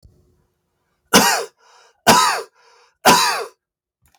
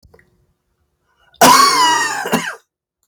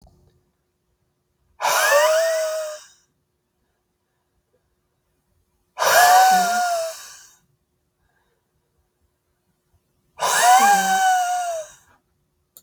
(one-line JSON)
{"three_cough_length": "4.2 s", "three_cough_amplitude": 32768, "three_cough_signal_mean_std_ratio": 0.39, "cough_length": "3.1 s", "cough_amplitude": 32768, "cough_signal_mean_std_ratio": 0.47, "exhalation_length": "12.6 s", "exhalation_amplitude": 27626, "exhalation_signal_mean_std_ratio": 0.46, "survey_phase": "beta (2021-08-13 to 2022-03-07)", "age": "18-44", "gender": "Male", "wearing_mask": "No", "symptom_none": true, "smoker_status": "Never smoked", "respiratory_condition_asthma": false, "respiratory_condition_other": false, "recruitment_source": "Test and Trace", "submission_delay": "0 days", "covid_test_result": "Negative", "covid_test_method": "RT-qPCR"}